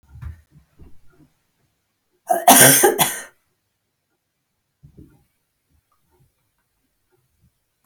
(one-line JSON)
{"cough_length": "7.9 s", "cough_amplitude": 32768, "cough_signal_mean_std_ratio": 0.24, "survey_phase": "beta (2021-08-13 to 2022-03-07)", "age": "65+", "gender": "Female", "wearing_mask": "No", "symptom_none": true, "smoker_status": "Never smoked", "respiratory_condition_asthma": true, "respiratory_condition_other": false, "recruitment_source": "REACT", "submission_delay": "1 day", "covid_test_result": "Negative", "covid_test_method": "RT-qPCR"}